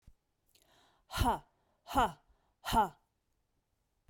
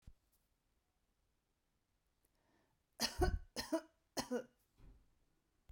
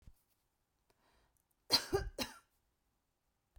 {
  "exhalation_length": "4.1 s",
  "exhalation_amplitude": 4375,
  "exhalation_signal_mean_std_ratio": 0.32,
  "three_cough_length": "5.7 s",
  "three_cough_amplitude": 3007,
  "three_cough_signal_mean_std_ratio": 0.28,
  "cough_length": "3.6 s",
  "cough_amplitude": 4918,
  "cough_signal_mean_std_ratio": 0.24,
  "survey_phase": "beta (2021-08-13 to 2022-03-07)",
  "age": "45-64",
  "gender": "Female",
  "wearing_mask": "No",
  "symptom_fatigue": true,
  "symptom_other": true,
  "smoker_status": "Ex-smoker",
  "respiratory_condition_asthma": false,
  "respiratory_condition_other": false,
  "recruitment_source": "REACT",
  "submission_delay": "2 days",
  "covid_test_result": "Negative",
  "covid_test_method": "RT-qPCR"
}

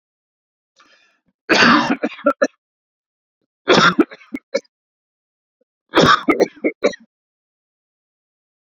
{
  "three_cough_length": "8.8 s",
  "three_cough_amplitude": 30721,
  "three_cough_signal_mean_std_ratio": 0.33,
  "survey_phase": "beta (2021-08-13 to 2022-03-07)",
  "age": "45-64",
  "gender": "Male",
  "wearing_mask": "No",
  "symptom_headache": true,
  "smoker_status": "Never smoked",
  "respiratory_condition_asthma": false,
  "respiratory_condition_other": false,
  "recruitment_source": "REACT",
  "submission_delay": "2 days",
  "covid_test_result": "Negative",
  "covid_test_method": "RT-qPCR"
}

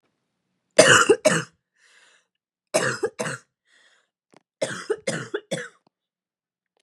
{
  "three_cough_length": "6.8 s",
  "three_cough_amplitude": 31970,
  "three_cough_signal_mean_std_ratio": 0.31,
  "survey_phase": "beta (2021-08-13 to 2022-03-07)",
  "age": "18-44",
  "gender": "Female",
  "wearing_mask": "No",
  "symptom_cough_any": true,
  "symptom_new_continuous_cough": true,
  "symptom_runny_or_blocked_nose": true,
  "symptom_fatigue": true,
  "symptom_headache": true,
  "symptom_onset": "2 days",
  "smoker_status": "Never smoked",
  "respiratory_condition_asthma": true,
  "respiratory_condition_other": false,
  "recruitment_source": "Test and Trace",
  "submission_delay": "1 day",
  "covid_test_result": "Positive",
  "covid_test_method": "RT-qPCR",
  "covid_ct_value": 26.8,
  "covid_ct_gene": "N gene"
}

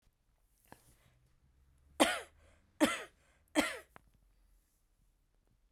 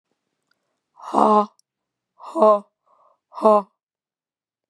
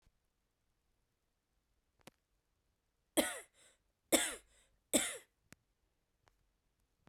{
  "three_cough_length": "5.7 s",
  "three_cough_amplitude": 10093,
  "three_cough_signal_mean_std_ratio": 0.24,
  "exhalation_length": "4.7 s",
  "exhalation_amplitude": 27714,
  "exhalation_signal_mean_std_ratio": 0.31,
  "cough_length": "7.1 s",
  "cough_amplitude": 6917,
  "cough_signal_mean_std_ratio": 0.21,
  "survey_phase": "beta (2021-08-13 to 2022-03-07)",
  "age": "18-44",
  "gender": "Female",
  "wearing_mask": "No",
  "symptom_cough_any": true,
  "symptom_fatigue": true,
  "smoker_status": "Never smoked",
  "respiratory_condition_asthma": false,
  "respiratory_condition_other": true,
  "recruitment_source": "REACT",
  "submission_delay": "0 days",
  "covid_test_result": "Negative",
  "covid_test_method": "RT-qPCR"
}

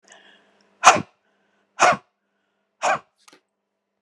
{
  "exhalation_length": "4.0 s",
  "exhalation_amplitude": 32768,
  "exhalation_signal_mean_std_ratio": 0.25,
  "survey_phase": "beta (2021-08-13 to 2022-03-07)",
  "age": "45-64",
  "gender": "Female",
  "wearing_mask": "No",
  "symptom_none": true,
  "smoker_status": "Ex-smoker",
  "respiratory_condition_asthma": false,
  "respiratory_condition_other": true,
  "recruitment_source": "REACT",
  "submission_delay": "2 days",
  "covid_test_result": "Negative",
  "covid_test_method": "RT-qPCR"
}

